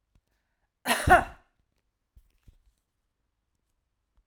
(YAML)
cough_length: 4.3 s
cough_amplitude: 19969
cough_signal_mean_std_ratio: 0.2
survey_phase: alpha (2021-03-01 to 2021-08-12)
age: 45-64
gender: Female
wearing_mask: 'No'
symptom_none: true
symptom_onset: 4 days
smoker_status: Ex-smoker
respiratory_condition_asthma: false
respiratory_condition_other: false
recruitment_source: REACT
submission_delay: 1 day
covid_test_result: Negative
covid_test_method: RT-qPCR